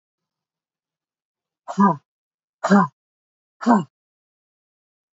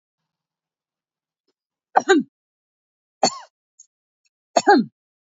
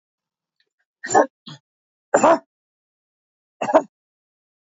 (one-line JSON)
{"exhalation_length": "5.1 s", "exhalation_amplitude": 25868, "exhalation_signal_mean_std_ratio": 0.27, "three_cough_length": "5.2 s", "three_cough_amplitude": 27640, "three_cough_signal_mean_std_ratio": 0.24, "cough_length": "4.6 s", "cough_amplitude": 26682, "cough_signal_mean_std_ratio": 0.25, "survey_phase": "beta (2021-08-13 to 2022-03-07)", "age": "45-64", "gender": "Female", "wearing_mask": "No", "symptom_none": true, "smoker_status": "Never smoked", "respiratory_condition_asthma": false, "respiratory_condition_other": false, "recruitment_source": "REACT", "submission_delay": "1 day", "covid_test_result": "Negative", "covid_test_method": "RT-qPCR", "influenza_a_test_result": "Negative", "influenza_b_test_result": "Negative"}